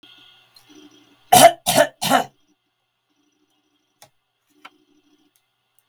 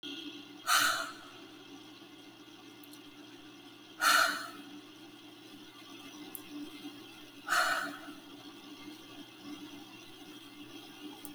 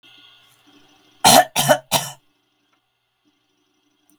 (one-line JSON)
{"three_cough_length": "5.9 s", "three_cough_amplitude": 32768, "three_cough_signal_mean_std_ratio": 0.24, "exhalation_length": "11.3 s", "exhalation_amplitude": 7160, "exhalation_signal_mean_std_ratio": 0.46, "cough_length": "4.2 s", "cough_amplitude": 32768, "cough_signal_mean_std_ratio": 0.27, "survey_phase": "beta (2021-08-13 to 2022-03-07)", "age": "45-64", "gender": "Female", "wearing_mask": "No", "symptom_none": true, "symptom_onset": "12 days", "smoker_status": "Never smoked", "respiratory_condition_asthma": false, "respiratory_condition_other": false, "recruitment_source": "REACT", "submission_delay": "19 days", "covid_test_result": "Negative", "covid_test_method": "RT-qPCR", "influenza_a_test_result": "Negative", "influenza_b_test_result": "Negative"}